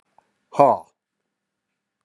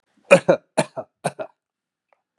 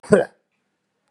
{
  "exhalation_length": "2.0 s",
  "exhalation_amplitude": 29612,
  "exhalation_signal_mean_std_ratio": 0.22,
  "three_cough_length": "2.4 s",
  "three_cough_amplitude": 32759,
  "three_cough_signal_mean_std_ratio": 0.25,
  "cough_length": "1.1 s",
  "cough_amplitude": 32744,
  "cough_signal_mean_std_ratio": 0.27,
  "survey_phase": "beta (2021-08-13 to 2022-03-07)",
  "age": "45-64",
  "gender": "Male",
  "wearing_mask": "No",
  "symptom_cough_any": true,
  "symptom_runny_or_blocked_nose": true,
  "symptom_sore_throat": true,
  "symptom_other": true,
  "symptom_onset": "6 days",
  "smoker_status": "Never smoked",
  "respiratory_condition_asthma": false,
  "respiratory_condition_other": false,
  "recruitment_source": "Test and Trace",
  "submission_delay": "2 days",
  "covid_test_result": "Positive",
  "covid_test_method": "RT-qPCR",
  "covid_ct_value": 19.4,
  "covid_ct_gene": "ORF1ab gene"
}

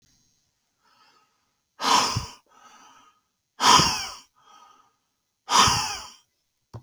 {
  "exhalation_length": "6.8 s",
  "exhalation_amplitude": 26770,
  "exhalation_signal_mean_std_ratio": 0.34,
  "survey_phase": "beta (2021-08-13 to 2022-03-07)",
  "age": "18-44",
  "gender": "Male",
  "wearing_mask": "No",
  "symptom_cough_any": true,
  "symptom_runny_or_blocked_nose": true,
  "symptom_sore_throat": true,
  "symptom_fatigue": true,
  "symptom_onset": "2 days",
  "smoker_status": "Never smoked",
  "respiratory_condition_asthma": false,
  "respiratory_condition_other": false,
  "recruitment_source": "Test and Trace",
  "submission_delay": "1 day",
  "covid_test_result": "Positive",
  "covid_test_method": "RT-qPCR",
  "covid_ct_value": 31.6,
  "covid_ct_gene": "N gene"
}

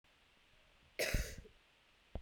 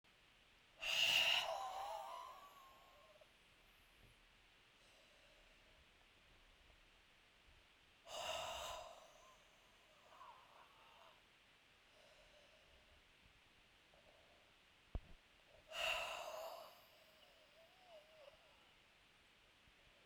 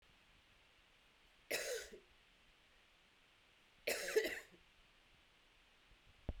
{
  "cough_length": "2.2 s",
  "cough_amplitude": 2710,
  "cough_signal_mean_std_ratio": 0.36,
  "exhalation_length": "20.1 s",
  "exhalation_amplitude": 1944,
  "exhalation_signal_mean_std_ratio": 0.37,
  "three_cough_length": "6.4 s",
  "three_cough_amplitude": 2297,
  "three_cough_signal_mean_std_ratio": 0.34,
  "survey_phase": "beta (2021-08-13 to 2022-03-07)",
  "age": "18-44",
  "gender": "Female",
  "wearing_mask": "No",
  "symptom_cough_any": true,
  "symptom_runny_or_blocked_nose": true,
  "symptom_sore_throat": true,
  "symptom_fatigue": true,
  "symptom_headache": true,
  "symptom_change_to_sense_of_smell_or_taste": true,
  "symptom_loss_of_taste": true,
  "smoker_status": "Never smoked",
  "respiratory_condition_asthma": false,
  "respiratory_condition_other": false,
  "recruitment_source": "Test and Trace",
  "submission_delay": "2 days",
  "covid_test_result": "Positive",
  "covid_test_method": "RT-qPCR",
  "covid_ct_value": 23.4,
  "covid_ct_gene": "ORF1ab gene"
}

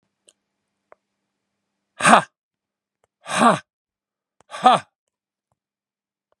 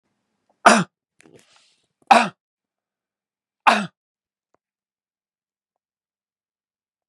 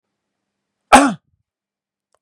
{
  "exhalation_length": "6.4 s",
  "exhalation_amplitude": 32768,
  "exhalation_signal_mean_std_ratio": 0.23,
  "three_cough_length": "7.1 s",
  "three_cough_amplitude": 32768,
  "three_cough_signal_mean_std_ratio": 0.19,
  "cough_length": "2.2 s",
  "cough_amplitude": 32768,
  "cough_signal_mean_std_ratio": 0.22,
  "survey_phase": "beta (2021-08-13 to 2022-03-07)",
  "age": "45-64",
  "gender": "Male",
  "wearing_mask": "No",
  "symptom_none": true,
  "smoker_status": "Ex-smoker",
  "respiratory_condition_asthma": false,
  "respiratory_condition_other": false,
  "recruitment_source": "REACT",
  "submission_delay": "5 days",
  "covid_test_result": "Negative",
  "covid_test_method": "RT-qPCR",
  "covid_ct_value": 37.8,
  "covid_ct_gene": "N gene",
  "influenza_a_test_result": "Negative",
  "influenza_b_test_result": "Negative"
}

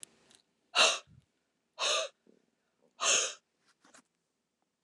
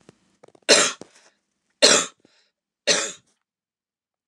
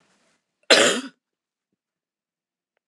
{
  "exhalation_length": "4.8 s",
  "exhalation_amplitude": 10441,
  "exhalation_signal_mean_std_ratio": 0.32,
  "three_cough_length": "4.3 s",
  "three_cough_amplitude": 29203,
  "three_cough_signal_mean_std_ratio": 0.29,
  "cough_length": "2.9 s",
  "cough_amplitude": 28945,
  "cough_signal_mean_std_ratio": 0.24,
  "survey_phase": "beta (2021-08-13 to 2022-03-07)",
  "age": "45-64",
  "gender": "Female",
  "wearing_mask": "No",
  "symptom_none": true,
  "symptom_onset": "12 days",
  "smoker_status": "Never smoked",
  "respiratory_condition_asthma": false,
  "respiratory_condition_other": false,
  "recruitment_source": "REACT",
  "submission_delay": "1 day",
  "covid_test_result": "Negative",
  "covid_test_method": "RT-qPCR"
}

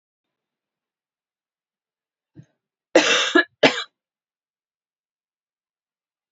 {
  "cough_length": "6.3 s",
  "cough_amplitude": 28079,
  "cough_signal_mean_std_ratio": 0.22,
  "survey_phase": "alpha (2021-03-01 to 2021-08-12)",
  "age": "45-64",
  "gender": "Female",
  "wearing_mask": "No",
  "symptom_cough_any": true,
  "symptom_headache": true,
  "symptom_onset": "3 days",
  "smoker_status": "Never smoked",
  "respiratory_condition_asthma": false,
  "respiratory_condition_other": false,
  "recruitment_source": "Test and Trace",
  "submission_delay": "1 day",
  "covid_test_result": "Positive",
  "covid_test_method": "RT-qPCR",
  "covid_ct_value": 17.5,
  "covid_ct_gene": "ORF1ab gene",
  "covid_ct_mean": 18.1,
  "covid_viral_load": "1100000 copies/ml",
  "covid_viral_load_category": "High viral load (>1M copies/ml)"
}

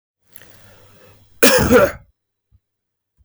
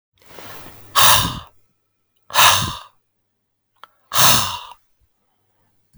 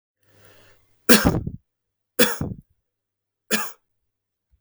{
  "cough_length": "3.2 s",
  "cough_amplitude": 32768,
  "cough_signal_mean_std_ratio": 0.33,
  "exhalation_length": "6.0 s",
  "exhalation_amplitude": 32768,
  "exhalation_signal_mean_std_ratio": 0.36,
  "three_cough_length": "4.6 s",
  "three_cough_amplitude": 32768,
  "three_cough_signal_mean_std_ratio": 0.28,
  "survey_phase": "beta (2021-08-13 to 2022-03-07)",
  "age": "18-44",
  "gender": "Male",
  "wearing_mask": "No",
  "symptom_fatigue": true,
  "symptom_headache": true,
  "symptom_onset": "11 days",
  "smoker_status": "Never smoked",
  "respiratory_condition_asthma": false,
  "respiratory_condition_other": false,
  "recruitment_source": "REACT",
  "submission_delay": "14 days",
  "covid_test_result": "Negative",
  "covid_test_method": "RT-qPCR"
}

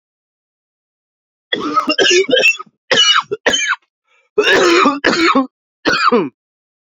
{
  "cough_length": "6.8 s",
  "cough_amplitude": 32767,
  "cough_signal_mean_std_ratio": 0.58,
  "survey_phase": "alpha (2021-03-01 to 2021-08-12)",
  "age": "18-44",
  "gender": "Male",
  "wearing_mask": "No",
  "symptom_cough_any": true,
  "symptom_fatigue": true,
  "symptom_fever_high_temperature": true,
  "symptom_headache": true,
  "smoker_status": "Never smoked",
  "respiratory_condition_asthma": false,
  "respiratory_condition_other": false,
  "recruitment_source": "Test and Trace",
  "submission_delay": "1 day",
  "covid_test_result": "Positive",
  "covid_test_method": "RT-qPCR",
  "covid_ct_value": 14.8,
  "covid_ct_gene": "ORF1ab gene",
  "covid_ct_mean": 16.3,
  "covid_viral_load": "4500000 copies/ml",
  "covid_viral_load_category": "High viral load (>1M copies/ml)"
}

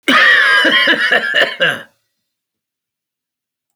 {
  "cough_length": "3.8 s",
  "cough_amplitude": 30298,
  "cough_signal_mean_std_ratio": 0.58,
  "survey_phase": "alpha (2021-03-01 to 2021-08-12)",
  "age": "45-64",
  "gender": "Male",
  "wearing_mask": "No",
  "symptom_shortness_of_breath": true,
  "symptom_abdominal_pain": true,
  "symptom_fatigue": true,
  "symptom_onset": "12 days",
  "smoker_status": "Never smoked",
  "respiratory_condition_asthma": false,
  "respiratory_condition_other": false,
  "recruitment_source": "REACT",
  "submission_delay": "2 days",
  "covid_test_result": "Negative",
  "covid_test_method": "RT-qPCR"
}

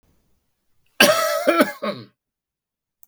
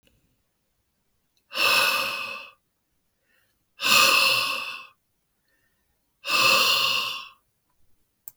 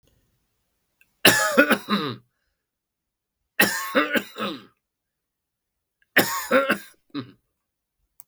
{
  "cough_length": "3.1 s",
  "cough_amplitude": 32766,
  "cough_signal_mean_std_ratio": 0.37,
  "exhalation_length": "8.4 s",
  "exhalation_amplitude": 22470,
  "exhalation_signal_mean_std_ratio": 0.45,
  "three_cough_length": "8.3 s",
  "three_cough_amplitude": 32768,
  "three_cough_signal_mean_std_ratio": 0.35,
  "survey_phase": "beta (2021-08-13 to 2022-03-07)",
  "age": "45-64",
  "gender": "Male",
  "wearing_mask": "No",
  "symptom_none": true,
  "symptom_onset": "12 days",
  "smoker_status": "Never smoked",
  "respiratory_condition_asthma": false,
  "respiratory_condition_other": false,
  "recruitment_source": "REACT",
  "submission_delay": "1 day",
  "covid_test_result": "Negative",
  "covid_test_method": "RT-qPCR",
  "influenza_a_test_result": "Negative",
  "influenza_b_test_result": "Negative"
}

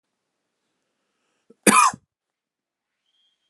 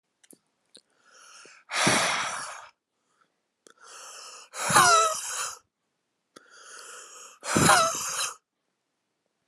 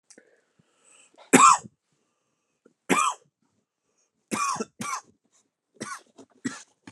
{
  "cough_length": "3.5 s",
  "cough_amplitude": 31296,
  "cough_signal_mean_std_ratio": 0.21,
  "exhalation_length": "9.5 s",
  "exhalation_amplitude": 18784,
  "exhalation_signal_mean_std_ratio": 0.4,
  "three_cough_length": "6.9 s",
  "three_cough_amplitude": 28191,
  "three_cough_signal_mean_std_ratio": 0.26,
  "survey_phase": "alpha (2021-03-01 to 2021-08-12)",
  "age": "18-44",
  "gender": "Male",
  "wearing_mask": "No",
  "symptom_cough_any": true,
  "symptom_new_continuous_cough": true,
  "symptom_fever_high_temperature": true,
  "symptom_headache": true,
  "symptom_change_to_sense_of_smell_or_taste": true,
  "smoker_status": "Never smoked",
  "respiratory_condition_asthma": false,
  "respiratory_condition_other": false,
  "recruitment_source": "Test and Trace",
  "submission_delay": "0 days",
  "covid_test_result": "Positive",
  "covid_test_method": "RT-qPCR",
  "covid_ct_value": 18.5,
  "covid_ct_gene": "ORF1ab gene",
  "covid_ct_mean": 19.6,
  "covid_viral_load": "380000 copies/ml",
  "covid_viral_load_category": "Low viral load (10K-1M copies/ml)"
}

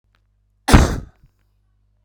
{
  "cough_length": "2.0 s",
  "cough_amplitude": 32768,
  "cough_signal_mean_std_ratio": 0.27,
  "survey_phase": "beta (2021-08-13 to 2022-03-07)",
  "age": "45-64",
  "gender": "Male",
  "wearing_mask": "No",
  "symptom_cough_any": true,
  "symptom_onset": "5 days",
  "smoker_status": "Current smoker (11 or more cigarettes per day)",
  "respiratory_condition_asthma": false,
  "respiratory_condition_other": false,
  "recruitment_source": "REACT",
  "submission_delay": "1 day",
  "covid_test_result": "Negative",
  "covid_test_method": "RT-qPCR"
}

